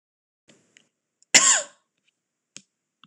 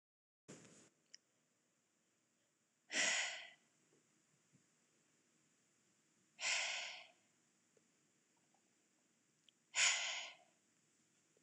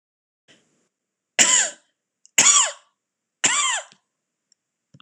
{
  "cough_length": "3.1 s",
  "cough_amplitude": 26028,
  "cough_signal_mean_std_ratio": 0.22,
  "exhalation_length": "11.4 s",
  "exhalation_amplitude": 2668,
  "exhalation_signal_mean_std_ratio": 0.3,
  "three_cough_length": "5.0 s",
  "three_cough_amplitude": 26028,
  "three_cough_signal_mean_std_ratio": 0.34,
  "survey_phase": "beta (2021-08-13 to 2022-03-07)",
  "age": "18-44",
  "gender": "Female",
  "wearing_mask": "No",
  "symptom_none": true,
  "smoker_status": "Never smoked",
  "respiratory_condition_asthma": false,
  "respiratory_condition_other": false,
  "recruitment_source": "REACT",
  "submission_delay": "3 days",
  "covid_test_result": "Negative",
  "covid_test_method": "RT-qPCR",
  "influenza_a_test_result": "Negative",
  "influenza_b_test_result": "Negative"
}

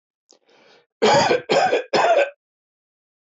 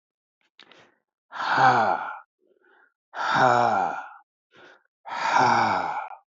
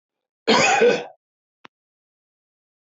{
  "three_cough_length": "3.2 s",
  "three_cough_amplitude": 18813,
  "three_cough_signal_mean_std_ratio": 0.5,
  "exhalation_length": "6.4 s",
  "exhalation_amplitude": 17732,
  "exhalation_signal_mean_std_ratio": 0.52,
  "cough_length": "2.9 s",
  "cough_amplitude": 19966,
  "cough_signal_mean_std_ratio": 0.36,
  "survey_phase": "beta (2021-08-13 to 2022-03-07)",
  "age": "65+",
  "gender": "Male",
  "wearing_mask": "No",
  "symptom_none": true,
  "symptom_onset": "12 days",
  "smoker_status": "Never smoked",
  "respiratory_condition_asthma": false,
  "respiratory_condition_other": false,
  "recruitment_source": "REACT",
  "submission_delay": "2 days",
  "covid_test_result": "Positive",
  "covid_test_method": "RT-qPCR",
  "covid_ct_value": 25.0,
  "covid_ct_gene": "E gene",
  "influenza_a_test_result": "Negative",
  "influenza_b_test_result": "Negative"
}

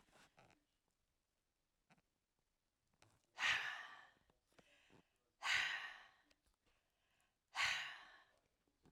{
  "exhalation_length": "8.9 s",
  "exhalation_amplitude": 1598,
  "exhalation_signal_mean_std_ratio": 0.32,
  "survey_phase": "alpha (2021-03-01 to 2021-08-12)",
  "age": "65+",
  "gender": "Female",
  "wearing_mask": "No",
  "symptom_none": true,
  "smoker_status": "Never smoked",
  "respiratory_condition_asthma": false,
  "respiratory_condition_other": false,
  "recruitment_source": "REACT",
  "submission_delay": "3 days",
  "covid_test_result": "Negative",
  "covid_test_method": "RT-qPCR"
}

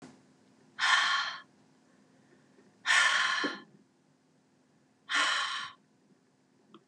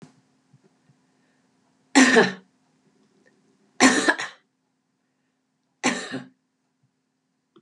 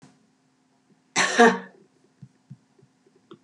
{
  "exhalation_length": "6.9 s",
  "exhalation_amplitude": 8350,
  "exhalation_signal_mean_std_ratio": 0.43,
  "three_cough_length": "7.6 s",
  "three_cough_amplitude": 30672,
  "three_cough_signal_mean_std_ratio": 0.27,
  "cough_length": "3.4 s",
  "cough_amplitude": 26151,
  "cough_signal_mean_std_ratio": 0.26,
  "survey_phase": "beta (2021-08-13 to 2022-03-07)",
  "age": "65+",
  "gender": "Female",
  "wearing_mask": "No",
  "symptom_none": true,
  "smoker_status": "Never smoked",
  "respiratory_condition_asthma": false,
  "respiratory_condition_other": false,
  "recruitment_source": "REACT",
  "submission_delay": "4 days",
  "covid_test_result": "Negative",
  "covid_test_method": "RT-qPCR",
  "influenza_a_test_result": "Negative",
  "influenza_b_test_result": "Negative"
}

